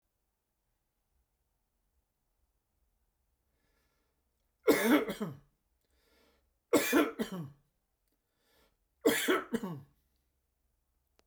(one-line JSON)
{"three_cough_length": "11.3 s", "three_cough_amplitude": 7779, "three_cough_signal_mean_std_ratio": 0.29, "survey_phase": "beta (2021-08-13 to 2022-03-07)", "age": "65+", "gender": "Male", "wearing_mask": "No", "symptom_none": true, "smoker_status": "Ex-smoker", "respiratory_condition_asthma": false, "respiratory_condition_other": false, "recruitment_source": "REACT", "submission_delay": "8 days", "covid_test_result": "Negative", "covid_test_method": "RT-qPCR"}